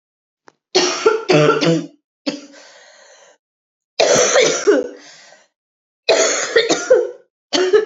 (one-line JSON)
{"three_cough_length": "7.9 s", "three_cough_amplitude": 30948, "three_cough_signal_mean_std_ratio": 0.54, "survey_phase": "beta (2021-08-13 to 2022-03-07)", "age": "45-64", "gender": "Female", "wearing_mask": "Yes", "symptom_cough_any": true, "symptom_runny_or_blocked_nose": true, "symptom_fatigue": true, "symptom_fever_high_temperature": true, "symptom_headache": true, "symptom_change_to_sense_of_smell_or_taste": true, "symptom_onset": "3 days", "smoker_status": "Never smoked", "respiratory_condition_asthma": false, "respiratory_condition_other": false, "recruitment_source": "Test and Trace", "submission_delay": "2 days", "covid_test_result": "Positive", "covid_test_method": "RT-qPCR", "covid_ct_value": 25.2, "covid_ct_gene": "ORF1ab gene", "covid_ct_mean": 25.5, "covid_viral_load": "4400 copies/ml", "covid_viral_load_category": "Minimal viral load (< 10K copies/ml)"}